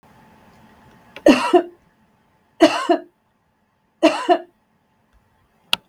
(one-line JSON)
{"three_cough_length": "5.9 s", "three_cough_amplitude": 32768, "three_cough_signal_mean_std_ratio": 0.3, "survey_phase": "beta (2021-08-13 to 2022-03-07)", "age": "45-64", "gender": "Female", "wearing_mask": "No", "symptom_none": true, "smoker_status": "Never smoked", "respiratory_condition_asthma": false, "respiratory_condition_other": false, "recruitment_source": "REACT", "submission_delay": "7 days", "covid_test_result": "Negative", "covid_test_method": "RT-qPCR"}